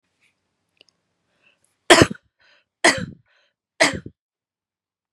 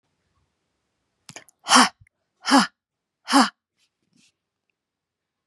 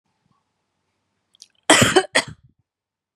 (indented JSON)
{
  "three_cough_length": "5.1 s",
  "three_cough_amplitude": 32768,
  "three_cough_signal_mean_std_ratio": 0.22,
  "exhalation_length": "5.5 s",
  "exhalation_amplitude": 29596,
  "exhalation_signal_mean_std_ratio": 0.25,
  "cough_length": "3.2 s",
  "cough_amplitude": 32125,
  "cough_signal_mean_std_ratio": 0.27,
  "survey_phase": "beta (2021-08-13 to 2022-03-07)",
  "age": "18-44",
  "gender": "Female",
  "wearing_mask": "No",
  "symptom_none": true,
  "smoker_status": "Ex-smoker",
  "respiratory_condition_asthma": false,
  "respiratory_condition_other": false,
  "recruitment_source": "REACT",
  "submission_delay": "2 days",
  "covid_test_result": "Negative",
  "covid_test_method": "RT-qPCR",
  "influenza_a_test_result": "Negative",
  "influenza_b_test_result": "Negative"
}